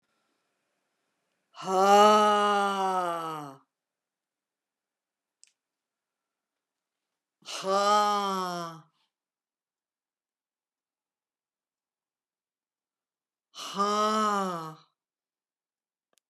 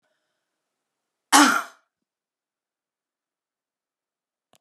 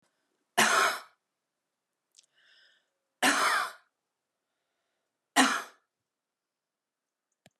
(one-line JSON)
{"exhalation_length": "16.3 s", "exhalation_amplitude": 13014, "exhalation_signal_mean_std_ratio": 0.36, "cough_length": "4.6 s", "cough_amplitude": 30349, "cough_signal_mean_std_ratio": 0.19, "three_cough_length": "7.6 s", "three_cough_amplitude": 15447, "three_cough_signal_mean_std_ratio": 0.3, "survey_phase": "beta (2021-08-13 to 2022-03-07)", "age": "65+", "gender": "Female", "wearing_mask": "No", "symptom_none": true, "smoker_status": "Never smoked", "respiratory_condition_asthma": false, "respiratory_condition_other": false, "recruitment_source": "REACT", "submission_delay": "2 days", "covid_test_result": "Negative", "covid_test_method": "RT-qPCR", "influenza_a_test_result": "Unknown/Void", "influenza_b_test_result": "Unknown/Void"}